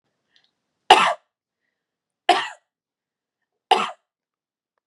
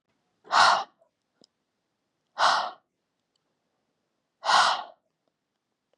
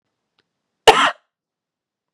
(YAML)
three_cough_length: 4.9 s
three_cough_amplitude: 32768
three_cough_signal_mean_std_ratio: 0.23
exhalation_length: 6.0 s
exhalation_amplitude: 16662
exhalation_signal_mean_std_ratio: 0.31
cough_length: 2.1 s
cough_amplitude: 32768
cough_signal_mean_std_ratio: 0.23
survey_phase: beta (2021-08-13 to 2022-03-07)
age: 18-44
gender: Female
wearing_mask: 'No'
symptom_none: true
smoker_status: Current smoker (11 or more cigarettes per day)
respiratory_condition_asthma: false
respiratory_condition_other: false
recruitment_source: REACT
submission_delay: 2 days
covid_test_result: Negative
covid_test_method: RT-qPCR
influenza_a_test_result: Unknown/Void
influenza_b_test_result: Unknown/Void